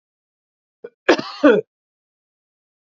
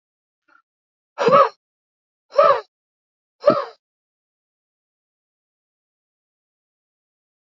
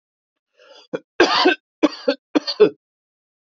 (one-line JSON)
{"cough_length": "3.0 s", "cough_amplitude": 28937, "cough_signal_mean_std_ratio": 0.25, "exhalation_length": "7.4 s", "exhalation_amplitude": 29534, "exhalation_signal_mean_std_ratio": 0.23, "three_cough_length": "3.5 s", "three_cough_amplitude": 27105, "three_cough_signal_mean_std_ratio": 0.34, "survey_phase": "alpha (2021-03-01 to 2021-08-12)", "age": "45-64", "gender": "Male", "wearing_mask": "No", "symptom_none": true, "smoker_status": "Ex-smoker", "respiratory_condition_asthma": false, "respiratory_condition_other": false, "recruitment_source": "REACT", "submission_delay": "1 day", "covid_test_result": "Negative", "covid_test_method": "RT-qPCR"}